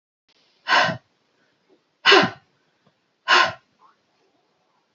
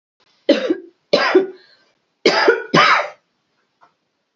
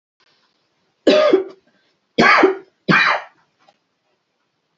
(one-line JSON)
{"exhalation_length": "4.9 s", "exhalation_amplitude": 28276, "exhalation_signal_mean_std_ratio": 0.29, "cough_length": "4.4 s", "cough_amplitude": 31837, "cough_signal_mean_std_ratio": 0.43, "three_cough_length": "4.8 s", "three_cough_amplitude": 30257, "three_cough_signal_mean_std_ratio": 0.39, "survey_phase": "alpha (2021-03-01 to 2021-08-12)", "age": "45-64", "gender": "Female", "wearing_mask": "No", "symptom_none": true, "smoker_status": "Ex-smoker", "respiratory_condition_asthma": false, "respiratory_condition_other": false, "recruitment_source": "REACT", "submission_delay": "1 day", "covid_test_result": "Negative", "covid_test_method": "RT-qPCR"}